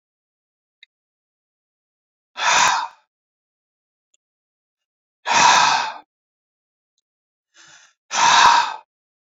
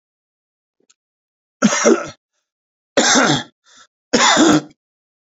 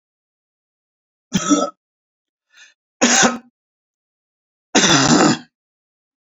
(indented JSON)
{
  "exhalation_length": "9.2 s",
  "exhalation_amplitude": 27855,
  "exhalation_signal_mean_std_ratio": 0.34,
  "cough_length": "5.4 s",
  "cough_amplitude": 30479,
  "cough_signal_mean_std_ratio": 0.41,
  "three_cough_length": "6.2 s",
  "three_cough_amplitude": 32767,
  "three_cough_signal_mean_std_ratio": 0.36,
  "survey_phase": "beta (2021-08-13 to 2022-03-07)",
  "age": "65+",
  "gender": "Male",
  "wearing_mask": "No",
  "symptom_diarrhoea": true,
  "smoker_status": "Never smoked",
  "respiratory_condition_asthma": false,
  "respiratory_condition_other": false,
  "recruitment_source": "REACT",
  "submission_delay": "1 day",
  "covid_test_result": "Negative",
  "covid_test_method": "RT-qPCR"
}